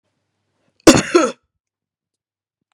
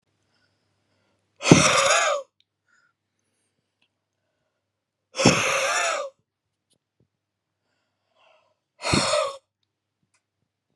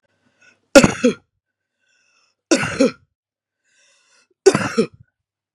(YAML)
cough_length: 2.7 s
cough_amplitude: 32768
cough_signal_mean_std_ratio: 0.25
exhalation_length: 10.8 s
exhalation_amplitude: 32768
exhalation_signal_mean_std_ratio: 0.32
three_cough_length: 5.5 s
three_cough_amplitude: 32768
three_cough_signal_mean_std_ratio: 0.27
survey_phase: beta (2021-08-13 to 2022-03-07)
age: 18-44
gender: Male
wearing_mask: 'No'
symptom_headache: true
smoker_status: Never smoked
respiratory_condition_asthma: false
respiratory_condition_other: false
recruitment_source: Test and Trace
submission_delay: 1 day
covid_test_result: Positive
covid_test_method: RT-qPCR
covid_ct_value: 29.4
covid_ct_gene: ORF1ab gene
covid_ct_mean: 29.9
covid_viral_load: 150 copies/ml
covid_viral_load_category: Minimal viral load (< 10K copies/ml)